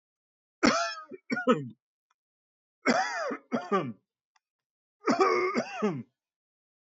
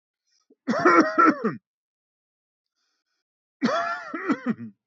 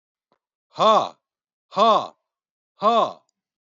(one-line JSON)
{"three_cough_length": "6.8 s", "three_cough_amplitude": 10541, "three_cough_signal_mean_std_ratio": 0.45, "cough_length": "4.9 s", "cough_amplitude": 19850, "cough_signal_mean_std_ratio": 0.41, "exhalation_length": "3.7 s", "exhalation_amplitude": 20011, "exhalation_signal_mean_std_ratio": 0.37, "survey_phase": "beta (2021-08-13 to 2022-03-07)", "age": "65+", "gender": "Male", "wearing_mask": "No", "symptom_none": true, "smoker_status": "Never smoked", "respiratory_condition_asthma": false, "respiratory_condition_other": false, "recruitment_source": "REACT", "submission_delay": "1 day", "covid_test_result": "Negative", "covid_test_method": "RT-qPCR", "influenza_a_test_result": "Negative", "influenza_b_test_result": "Negative"}